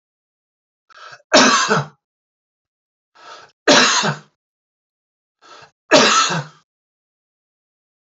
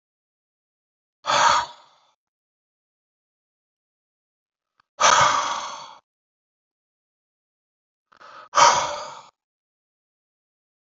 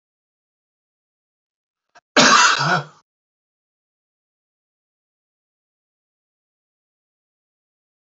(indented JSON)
{
  "three_cough_length": "8.1 s",
  "three_cough_amplitude": 31249,
  "three_cough_signal_mean_std_ratio": 0.34,
  "exhalation_length": "10.9 s",
  "exhalation_amplitude": 22999,
  "exhalation_signal_mean_std_ratio": 0.28,
  "cough_length": "8.0 s",
  "cough_amplitude": 29780,
  "cough_signal_mean_std_ratio": 0.22,
  "survey_phase": "alpha (2021-03-01 to 2021-08-12)",
  "age": "65+",
  "gender": "Male",
  "wearing_mask": "No",
  "symptom_none": true,
  "smoker_status": "Ex-smoker",
  "respiratory_condition_asthma": false,
  "respiratory_condition_other": false,
  "recruitment_source": "REACT",
  "submission_delay": "2 days",
  "covid_test_result": "Negative",
  "covid_test_method": "RT-qPCR"
}